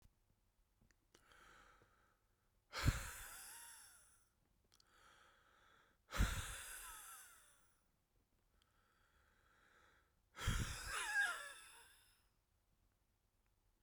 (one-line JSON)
{"exhalation_length": "13.8 s", "exhalation_amplitude": 2358, "exhalation_signal_mean_std_ratio": 0.34, "survey_phase": "beta (2021-08-13 to 2022-03-07)", "age": "65+", "gender": "Male", "wearing_mask": "No", "symptom_cough_any": true, "symptom_runny_or_blocked_nose": true, "symptom_shortness_of_breath": true, "symptom_fatigue": true, "smoker_status": "Current smoker (1 to 10 cigarettes per day)", "respiratory_condition_asthma": false, "respiratory_condition_other": false, "recruitment_source": "Test and Trace", "submission_delay": "2 days", "covid_test_result": "Positive", "covid_test_method": "LFT"}